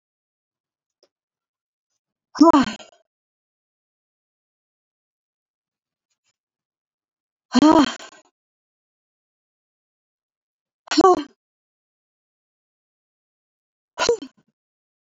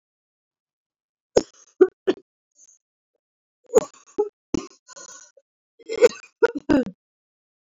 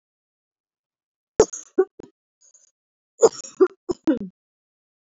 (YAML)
exhalation_length: 15.2 s
exhalation_amplitude: 25556
exhalation_signal_mean_std_ratio: 0.2
three_cough_length: 7.7 s
three_cough_amplitude: 26557
three_cough_signal_mean_std_ratio: 0.23
cough_length: 5.0 s
cough_amplitude: 27426
cough_signal_mean_std_ratio: 0.23
survey_phase: beta (2021-08-13 to 2022-03-07)
age: 18-44
gender: Female
wearing_mask: 'No'
symptom_none: true
smoker_status: Never smoked
respiratory_condition_asthma: true
respiratory_condition_other: false
recruitment_source: REACT
submission_delay: 3 days
covid_test_result: Negative
covid_test_method: RT-qPCR
influenza_a_test_result: Negative
influenza_b_test_result: Negative